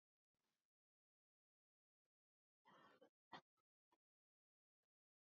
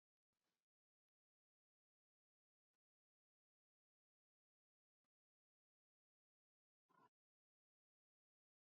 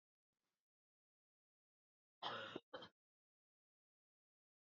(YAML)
three_cough_length: 5.4 s
three_cough_amplitude: 155
three_cough_signal_mean_std_ratio: 0.18
exhalation_length: 8.7 s
exhalation_amplitude: 21
exhalation_signal_mean_std_ratio: 0.12
cough_length: 4.8 s
cough_amplitude: 709
cough_signal_mean_std_ratio: 0.24
survey_phase: beta (2021-08-13 to 2022-03-07)
age: 45-64
gender: Female
wearing_mask: 'No'
symptom_cough_any: true
symptom_runny_or_blocked_nose: true
symptom_fatigue: true
symptom_fever_high_temperature: true
symptom_headache: true
symptom_onset: 3 days
smoker_status: Never smoked
respiratory_condition_asthma: false
respiratory_condition_other: false
recruitment_source: Test and Trace
submission_delay: 2 days
covid_test_result: Positive
covid_test_method: RT-qPCR
covid_ct_value: 15.4
covid_ct_gene: ORF1ab gene
covid_ct_mean: 15.7
covid_viral_load: 6900000 copies/ml
covid_viral_load_category: High viral load (>1M copies/ml)